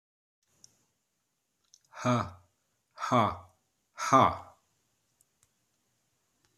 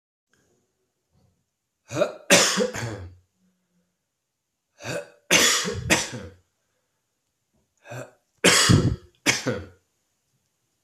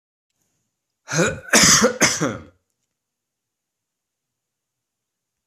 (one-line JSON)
{"exhalation_length": "6.6 s", "exhalation_amplitude": 12775, "exhalation_signal_mean_std_ratio": 0.27, "three_cough_length": "10.8 s", "three_cough_amplitude": 27354, "three_cough_signal_mean_std_ratio": 0.36, "cough_length": "5.5 s", "cough_amplitude": 32767, "cough_signal_mean_std_ratio": 0.32, "survey_phase": "alpha (2021-03-01 to 2021-08-12)", "age": "45-64", "gender": "Male", "wearing_mask": "No", "symptom_cough_any": true, "symptom_shortness_of_breath": true, "symptom_fatigue": true, "symptom_onset": "3 days", "smoker_status": "Never smoked", "respiratory_condition_asthma": false, "respiratory_condition_other": false, "recruitment_source": "Test and Trace", "submission_delay": "2 days", "covid_test_result": "Positive", "covid_test_method": "RT-qPCR", "covid_ct_value": 23.7, "covid_ct_gene": "ORF1ab gene", "covid_ct_mean": 24.2, "covid_viral_load": "11000 copies/ml", "covid_viral_load_category": "Low viral load (10K-1M copies/ml)"}